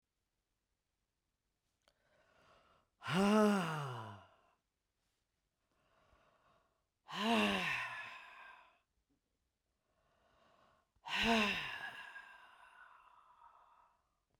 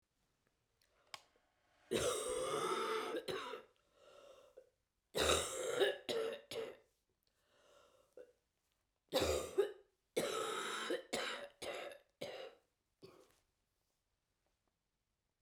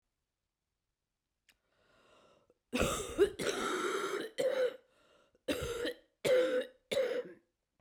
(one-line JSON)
{"exhalation_length": "14.4 s", "exhalation_amplitude": 3142, "exhalation_signal_mean_std_ratio": 0.35, "three_cough_length": "15.4 s", "three_cough_amplitude": 3214, "three_cough_signal_mean_std_ratio": 0.47, "cough_length": "7.8 s", "cough_amplitude": 4842, "cough_signal_mean_std_ratio": 0.51, "survey_phase": "beta (2021-08-13 to 2022-03-07)", "age": "65+", "gender": "Female", "wearing_mask": "No", "symptom_cough_any": true, "symptom_runny_or_blocked_nose": true, "symptom_shortness_of_breath": true, "symptom_fatigue": true, "symptom_headache": true, "symptom_change_to_sense_of_smell_or_taste": true, "symptom_onset": "4 days", "smoker_status": "Ex-smoker", "respiratory_condition_asthma": true, "respiratory_condition_other": false, "recruitment_source": "Test and Trace", "submission_delay": "3 days", "covid_test_result": "Positive", "covid_test_method": "RT-qPCR"}